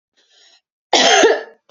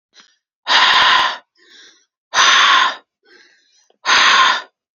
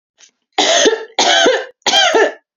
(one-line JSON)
{"cough_length": "1.7 s", "cough_amplitude": 30026, "cough_signal_mean_std_ratio": 0.45, "exhalation_length": "4.9 s", "exhalation_amplitude": 32061, "exhalation_signal_mean_std_ratio": 0.54, "three_cough_length": "2.6 s", "three_cough_amplitude": 31801, "three_cough_signal_mean_std_ratio": 0.67, "survey_phase": "alpha (2021-03-01 to 2021-08-12)", "age": "18-44", "gender": "Female", "wearing_mask": "No", "symptom_none": true, "smoker_status": "Never smoked", "respiratory_condition_asthma": false, "respiratory_condition_other": false, "recruitment_source": "REACT", "submission_delay": "1 day", "covid_test_result": "Negative", "covid_test_method": "RT-qPCR"}